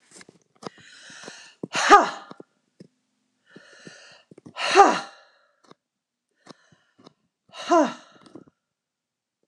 {"exhalation_length": "9.5 s", "exhalation_amplitude": 29203, "exhalation_signal_mean_std_ratio": 0.24, "survey_phase": "alpha (2021-03-01 to 2021-08-12)", "age": "45-64", "gender": "Female", "wearing_mask": "No", "symptom_none": true, "smoker_status": "Current smoker (11 or more cigarettes per day)", "respiratory_condition_asthma": false, "respiratory_condition_other": false, "recruitment_source": "REACT", "submission_delay": "1 day", "covid_test_result": "Negative", "covid_test_method": "RT-qPCR"}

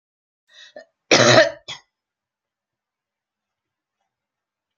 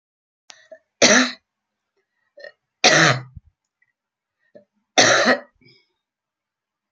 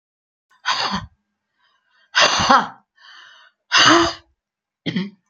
{"cough_length": "4.8 s", "cough_amplitude": 29888, "cough_signal_mean_std_ratio": 0.23, "three_cough_length": "6.9 s", "three_cough_amplitude": 31178, "three_cough_signal_mean_std_ratio": 0.31, "exhalation_length": "5.3 s", "exhalation_amplitude": 32767, "exhalation_signal_mean_std_ratio": 0.4, "survey_phase": "beta (2021-08-13 to 2022-03-07)", "age": "65+", "gender": "Female", "wearing_mask": "No", "symptom_none": true, "smoker_status": "Ex-smoker", "respiratory_condition_asthma": false, "respiratory_condition_other": false, "recruitment_source": "REACT", "submission_delay": "1 day", "covid_test_result": "Negative", "covid_test_method": "RT-qPCR", "influenza_a_test_result": "Negative", "influenza_b_test_result": "Negative"}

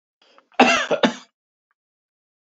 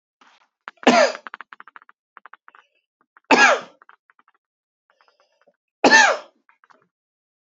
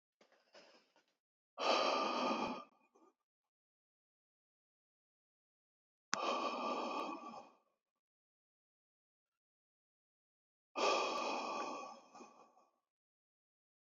{"cough_length": "2.6 s", "cough_amplitude": 27677, "cough_signal_mean_std_ratio": 0.31, "three_cough_length": "7.6 s", "three_cough_amplitude": 30698, "three_cough_signal_mean_std_ratio": 0.27, "exhalation_length": "13.9 s", "exhalation_amplitude": 6677, "exhalation_signal_mean_std_ratio": 0.39, "survey_phase": "beta (2021-08-13 to 2022-03-07)", "age": "18-44", "gender": "Male", "wearing_mask": "No", "symptom_cough_any": true, "symptom_runny_or_blocked_nose": true, "symptom_headache": true, "symptom_change_to_sense_of_smell_or_taste": true, "smoker_status": "Never smoked", "respiratory_condition_asthma": false, "respiratory_condition_other": false, "recruitment_source": "Test and Trace", "submission_delay": "3 days", "covid_test_result": "Positive", "covid_test_method": "RT-qPCR", "covid_ct_value": 18.7, "covid_ct_gene": "ORF1ab gene", "covid_ct_mean": 19.2, "covid_viral_load": "500000 copies/ml", "covid_viral_load_category": "Low viral load (10K-1M copies/ml)"}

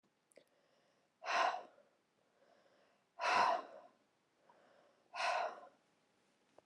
{"exhalation_length": "6.7 s", "exhalation_amplitude": 3144, "exhalation_signal_mean_std_ratio": 0.35, "survey_phase": "beta (2021-08-13 to 2022-03-07)", "age": "45-64", "gender": "Female", "wearing_mask": "No", "symptom_cough_any": true, "symptom_sore_throat": true, "symptom_fatigue": true, "symptom_headache": true, "symptom_change_to_sense_of_smell_or_taste": true, "smoker_status": "Never smoked", "respiratory_condition_asthma": false, "respiratory_condition_other": false, "recruitment_source": "Test and Trace", "submission_delay": "1 day", "covid_test_result": "Positive", "covid_test_method": "RT-qPCR", "covid_ct_value": 20.6, "covid_ct_gene": "N gene", "covid_ct_mean": 21.0, "covid_viral_load": "130000 copies/ml", "covid_viral_load_category": "Low viral load (10K-1M copies/ml)"}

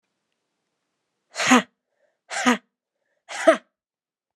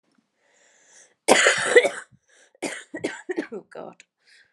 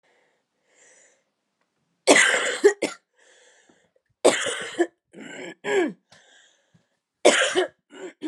{"exhalation_length": "4.4 s", "exhalation_amplitude": 28960, "exhalation_signal_mean_std_ratio": 0.26, "cough_length": "4.5 s", "cough_amplitude": 32222, "cough_signal_mean_std_ratio": 0.33, "three_cough_length": "8.3 s", "three_cough_amplitude": 30022, "three_cough_signal_mean_std_ratio": 0.36, "survey_phase": "beta (2021-08-13 to 2022-03-07)", "age": "18-44", "gender": "Female", "wearing_mask": "No", "symptom_cough_any": true, "symptom_new_continuous_cough": true, "symptom_runny_or_blocked_nose": true, "symptom_fatigue": true, "symptom_headache": true, "symptom_change_to_sense_of_smell_or_taste": true, "symptom_loss_of_taste": true, "symptom_onset": "5 days", "smoker_status": "Never smoked", "respiratory_condition_asthma": false, "respiratory_condition_other": false, "recruitment_source": "Test and Trace", "submission_delay": "1 day", "covid_test_result": "Positive", "covid_test_method": "RT-qPCR", "covid_ct_value": 19.3, "covid_ct_gene": "ORF1ab gene", "covid_ct_mean": 20.0, "covid_viral_load": "270000 copies/ml", "covid_viral_load_category": "Low viral load (10K-1M copies/ml)"}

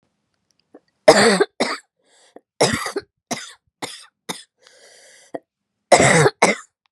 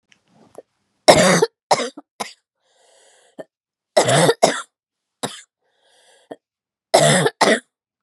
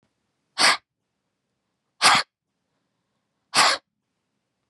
{"cough_length": "6.9 s", "cough_amplitude": 32768, "cough_signal_mean_std_ratio": 0.34, "three_cough_length": "8.0 s", "three_cough_amplitude": 32768, "three_cough_signal_mean_std_ratio": 0.35, "exhalation_length": "4.7 s", "exhalation_amplitude": 21754, "exhalation_signal_mean_std_ratio": 0.28, "survey_phase": "beta (2021-08-13 to 2022-03-07)", "age": "45-64", "gender": "Female", "wearing_mask": "No", "symptom_cough_any": true, "symptom_new_continuous_cough": true, "symptom_runny_or_blocked_nose": true, "symptom_shortness_of_breath": true, "symptom_sore_throat": true, "symptom_fatigue": true, "symptom_change_to_sense_of_smell_or_taste": true, "symptom_loss_of_taste": true, "smoker_status": "Ex-smoker", "respiratory_condition_asthma": false, "respiratory_condition_other": false, "recruitment_source": "Test and Trace", "submission_delay": "0 days", "covid_test_result": "Negative", "covid_test_method": "LFT"}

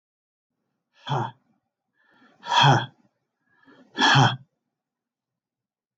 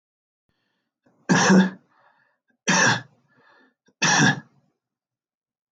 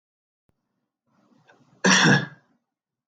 {"exhalation_length": "6.0 s", "exhalation_amplitude": 18312, "exhalation_signal_mean_std_ratio": 0.31, "three_cough_length": "5.7 s", "three_cough_amplitude": 18629, "three_cough_signal_mean_std_ratio": 0.36, "cough_length": "3.1 s", "cough_amplitude": 19866, "cough_signal_mean_std_ratio": 0.3, "survey_phase": "beta (2021-08-13 to 2022-03-07)", "age": "45-64", "gender": "Male", "wearing_mask": "No", "symptom_cough_any": true, "smoker_status": "Ex-smoker", "respiratory_condition_asthma": false, "respiratory_condition_other": false, "recruitment_source": "REACT", "submission_delay": "1 day", "covid_test_result": "Negative", "covid_test_method": "RT-qPCR", "influenza_a_test_result": "Negative", "influenza_b_test_result": "Negative"}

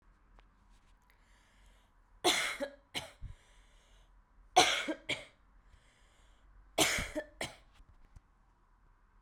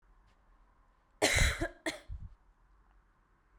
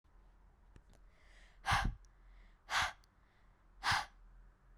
{"three_cough_length": "9.2 s", "three_cough_amplitude": 9740, "three_cough_signal_mean_std_ratio": 0.31, "cough_length": "3.6 s", "cough_amplitude": 6945, "cough_signal_mean_std_ratio": 0.33, "exhalation_length": "4.8 s", "exhalation_amplitude": 3375, "exhalation_signal_mean_std_ratio": 0.37, "survey_phase": "beta (2021-08-13 to 2022-03-07)", "age": "18-44", "gender": "Female", "wearing_mask": "No", "symptom_cough_any": true, "symptom_sore_throat": true, "symptom_fatigue": true, "symptom_onset": "4 days", "smoker_status": "Never smoked", "respiratory_condition_asthma": false, "respiratory_condition_other": false, "recruitment_source": "Test and Trace", "submission_delay": "1 day", "covid_test_result": "Positive", "covid_test_method": "ePCR"}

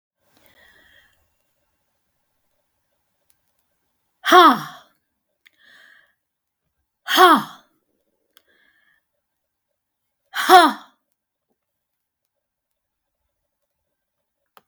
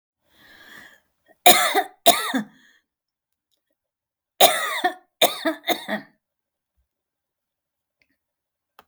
{"exhalation_length": "14.7 s", "exhalation_amplitude": 32768, "exhalation_signal_mean_std_ratio": 0.2, "cough_length": "8.9 s", "cough_amplitude": 32768, "cough_signal_mean_std_ratio": 0.28, "survey_phase": "beta (2021-08-13 to 2022-03-07)", "age": "65+", "gender": "Female", "wearing_mask": "No", "symptom_none": true, "smoker_status": "Ex-smoker", "respiratory_condition_asthma": false, "respiratory_condition_other": false, "recruitment_source": "REACT", "submission_delay": "2 days", "covid_test_result": "Negative", "covid_test_method": "RT-qPCR"}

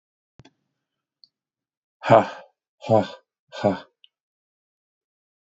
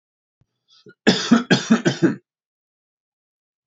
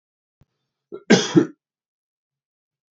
{"exhalation_length": "5.5 s", "exhalation_amplitude": 28994, "exhalation_signal_mean_std_ratio": 0.22, "three_cough_length": "3.7 s", "three_cough_amplitude": 27654, "three_cough_signal_mean_std_ratio": 0.34, "cough_length": "2.9 s", "cough_amplitude": 27595, "cough_signal_mean_std_ratio": 0.23, "survey_phase": "alpha (2021-03-01 to 2021-08-12)", "age": "18-44", "gender": "Male", "wearing_mask": "No", "symptom_fatigue": true, "symptom_fever_high_temperature": true, "symptom_headache": true, "symptom_change_to_sense_of_smell_or_taste": true, "symptom_onset": "5 days", "smoker_status": "Never smoked", "respiratory_condition_asthma": false, "respiratory_condition_other": false, "recruitment_source": "Test and Trace", "submission_delay": "2 days", "covid_test_result": "Positive", "covid_test_method": "ePCR"}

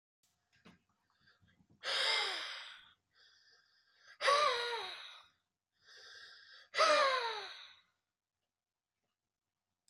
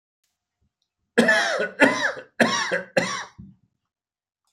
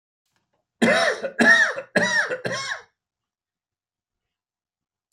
{"exhalation_length": "9.9 s", "exhalation_amplitude": 4715, "exhalation_signal_mean_std_ratio": 0.38, "three_cough_length": "4.5 s", "three_cough_amplitude": 27929, "three_cough_signal_mean_std_ratio": 0.44, "cough_length": "5.1 s", "cough_amplitude": 20992, "cough_signal_mean_std_ratio": 0.42, "survey_phase": "beta (2021-08-13 to 2022-03-07)", "age": "65+", "gender": "Male", "wearing_mask": "No", "symptom_cough_any": true, "symptom_sore_throat": true, "smoker_status": "Ex-smoker", "respiratory_condition_asthma": false, "respiratory_condition_other": false, "recruitment_source": "REACT", "submission_delay": "0 days", "covid_test_result": "Negative", "covid_test_method": "RT-qPCR", "influenza_a_test_result": "Negative", "influenza_b_test_result": "Negative"}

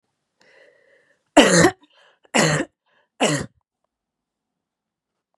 {"three_cough_length": "5.4 s", "three_cough_amplitude": 32767, "three_cough_signal_mean_std_ratio": 0.3, "survey_phase": "beta (2021-08-13 to 2022-03-07)", "age": "18-44", "gender": "Female", "wearing_mask": "No", "symptom_runny_or_blocked_nose": true, "symptom_fatigue": true, "symptom_headache": true, "smoker_status": "Never smoked", "respiratory_condition_asthma": false, "respiratory_condition_other": false, "recruitment_source": "Test and Trace", "submission_delay": "2 days", "covid_test_result": "Positive", "covid_test_method": "RT-qPCR", "covid_ct_value": 24.2, "covid_ct_gene": "N gene", "covid_ct_mean": 24.5, "covid_viral_load": "9400 copies/ml", "covid_viral_load_category": "Minimal viral load (< 10K copies/ml)"}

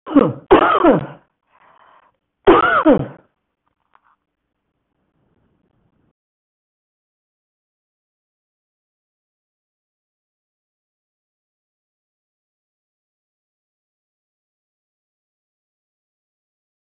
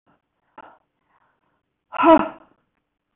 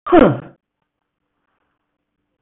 {"three_cough_length": "16.8 s", "three_cough_amplitude": 30263, "three_cough_signal_mean_std_ratio": 0.21, "exhalation_length": "3.2 s", "exhalation_amplitude": 25383, "exhalation_signal_mean_std_ratio": 0.23, "cough_length": "2.4 s", "cough_amplitude": 30726, "cough_signal_mean_std_ratio": 0.26, "survey_phase": "beta (2021-08-13 to 2022-03-07)", "age": "65+", "gender": "Female", "wearing_mask": "No", "symptom_cough_any": true, "symptom_runny_or_blocked_nose": true, "symptom_onset": "4 days", "smoker_status": "Ex-smoker", "respiratory_condition_asthma": false, "respiratory_condition_other": false, "recruitment_source": "REACT", "submission_delay": "1 day", "covid_test_result": "Negative", "covid_test_method": "RT-qPCR", "influenza_a_test_result": "Negative", "influenza_b_test_result": "Negative"}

